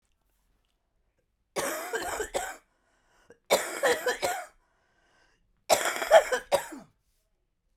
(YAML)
three_cough_length: 7.8 s
three_cough_amplitude: 18608
three_cough_signal_mean_std_ratio: 0.36
survey_phase: beta (2021-08-13 to 2022-03-07)
age: 45-64
gender: Female
wearing_mask: 'No'
symptom_cough_any: true
symptom_runny_or_blocked_nose: true
symptom_fatigue: true
symptom_change_to_sense_of_smell_or_taste: true
symptom_onset: 5 days
smoker_status: Current smoker (1 to 10 cigarettes per day)
respiratory_condition_asthma: false
respiratory_condition_other: true
recruitment_source: Test and Trace
submission_delay: 3 days
covid_test_result: Positive
covid_test_method: RT-qPCR